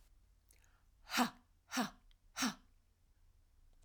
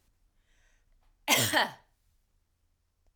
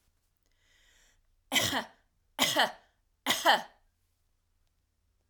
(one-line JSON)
{"exhalation_length": "3.8 s", "exhalation_amplitude": 2803, "exhalation_signal_mean_std_ratio": 0.32, "cough_length": "3.2 s", "cough_amplitude": 10076, "cough_signal_mean_std_ratio": 0.29, "three_cough_length": "5.3 s", "three_cough_amplitude": 9182, "three_cough_signal_mean_std_ratio": 0.32, "survey_phase": "alpha (2021-03-01 to 2021-08-12)", "age": "45-64", "gender": "Female", "wearing_mask": "No", "symptom_none": true, "smoker_status": "Never smoked", "respiratory_condition_asthma": false, "respiratory_condition_other": false, "recruitment_source": "REACT", "submission_delay": "3 days", "covid_test_result": "Negative", "covid_test_method": "RT-qPCR"}